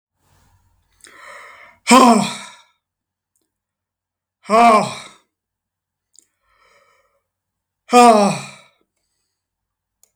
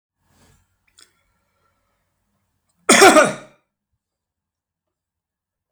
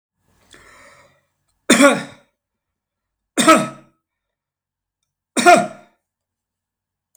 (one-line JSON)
{"exhalation_length": "10.2 s", "exhalation_amplitude": 32768, "exhalation_signal_mean_std_ratio": 0.29, "cough_length": "5.7 s", "cough_amplitude": 32768, "cough_signal_mean_std_ratio": 0.22, "three_cough_length": "7.2 s", "three_cough_amplitude": 32768, "three_cough_signal_mean_std_ratio": 0.27, "survey_phase": "beta (2021-08-13 to 2022-03-07)", "age": "65+", "gender": "Male", "wearing_mask": "No", "symptom_none": true, "smoker_status": "Never smoked", "respiratory_condition_asthma": false, "respiratory_condition_other": false, "recruitment_source": "REACT", "submission_delay": "2 days", "covid_test_result": "Negative", "covid_test_method": "RT-qPCR", "influenza_a_test_result": "Negative", "influenza_b_test_result": "Negative"}